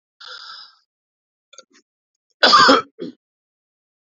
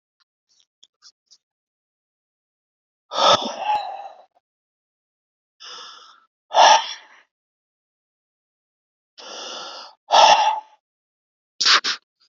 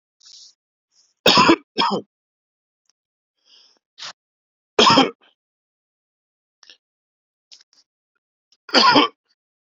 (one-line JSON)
{"cough_length": "4.1 s", "cough_amplitude": 32767, "cough_signal_mean_std_ratio": 0.27, "exhalation_length": "12.3 s", "exhalation_amplitude": 28606, "exhalation_signal_mean_std_ratio": 0.3, "three_cough_length": "9.6 s", "three_cough_amplitude": 30415, "three_cough_signal_mean_std_ratio": 0.27, "survey_phase": "beta (2021-08-13 to 2022-03-07)", "age": "45-64", "gender": "Male", "wearing_mask": "No", "symptom_none": true, "smoker_status": "Never smoked", "respiratory_condition_asthma": false, "respiratory_condition_other": false, "recruitment_source": "REACT", "submission_delay": "4 days", "covid_test_result": "Negative", "covid_test_method": "RT-qPCR", "influenza_a_test_result": "Negative", "influenza_b_test_result": "Negative"}